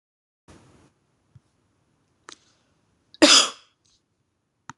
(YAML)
cough_length: 4.8 s
cough_amplitude: 26027
cough_signal_mean_std_ratio: 0.19
survey_phase: beta (2021-08-13 to 2022-03-07)
age: 18-44
gender: Female
wearing_mask: 'No'
symptom_none: true
smoker_status: Never smoked
respiratory_condition_asthma: false
respiratory_condition_other: false
recruitment_source: REACT
submission_delay: 3 days
covid_test_result: Negative
covid_test_method: RT-qPCR